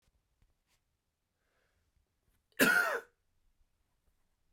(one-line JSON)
{"cough_length": "4.5 s", "cough_amplitude": 8668, "cough_signal_mean_std_ratio": 0.23, "survey_phase": "beta (2021-08-13 to 2022-03-07)", "age": "45-64", "gender": "Male", "wearing_mask": "No", "symptom_cough_any": true, "symptom_runny_or_blocked_nose": true, "symptom_shortness_of_breath": true, "symptom_sore_throat": true, "symptom_fatigue": true, "symptom_headache": true, "smoker_status": "Never smoked", "respiratory_condition_asthma": false, "respiratory_condition_other": false, "recruitment_source": "Test and Trace", "submission_delay": "3 days", "covid_test_result": "Positive", "covid_test_method": "RT-qPCR", "covid_ct_value": 25.5, "covid_ct_gene": "ORF1ab gene"}